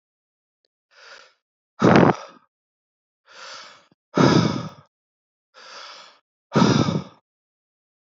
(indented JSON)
{
  "exhalation_length": "8.0 s",
  "exhalation_amplitude": 27477,
  "exhalation_signal_mean_std_ratio": 0.32,
  "survey_phase": "alpha (2021-03-01 to 2021-08-12)",
  "age": "18-44",
  "gender": "Male",
  "wearing_mask": "No",
  "symptom_none": true,
  "smoker_status": "Never smoked",
  "respiratory_condition_asthma": false,
  "respiratory_condition_other": false,
  "recruitment_source": "REACT",
  "submission_delay": "1 day",
  "covid_test_result": "Negative",
  "covid_test_method": "RT-qPCR"
}